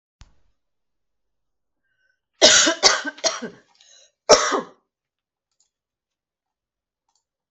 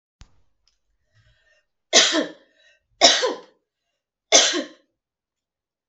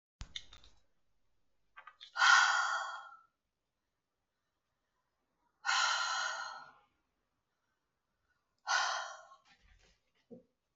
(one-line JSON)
{"cough_length": "7.5 s", "cough_amplitude": 32768, "cough_signal_mean_std_ratio": 0.26, "three_cough_length": "5.9 s", "three_cough_amplitude": 32768, "three_cough_signal_mean_std_ratio": 0.3, "exhalation_length": "10.8 s", "exhalation_amplitude": 8084, "exhalation_signal_mean_std_ratio": 0.33, "survey_phase": "beta (2021-08-13 to 2022-03-07)", "age": "45-64", "gender": "Female", "wearing_mask": "No", "symptom_none": true, "smoker_status": "Ex-smoker", "respiratory_condition_asthma": true, "respiratory_condition_other": false, "recruitment_source": "REACT", "submission_delay": "1 day", "covid_test_result": "Negative", "covid_test_method": "RT-qPCR", "influenza_a_test_result": "Negative", "influenza_b_test_result": "Negative"}